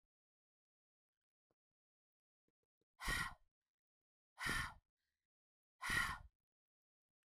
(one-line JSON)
{"exhalation_length": "7.2 s", "exhalation_amplitude": 1570, "exhalation_signal_mean_std_ratio": 0.29, "survey_phase": "beta (2021-08-13 to 2022-03-07)", "age": "45-64", "gender": "Female", "wearing_mask": "No", "symptom_prefer_not_to_say": true, "symptom_onset": "3 days", "smoker_status": "Ex-smoker", "respiratory_condition_asthma": false, "respiratory_condition_other": false, "recruitment_source": "Test and Trace", "submission_delay": "1 day", "covid_test_result": "Positive", "covid_test_method": "RT-qPCR", "covid_ct_value": 30.0, "covid_ct_gene": "N gene", "covid_ct_mean": 30.0, "covid_viral_load": "140 copies/ml", "covid_viral_load_category": "Minimal viral load (< 10K copies/ml)"}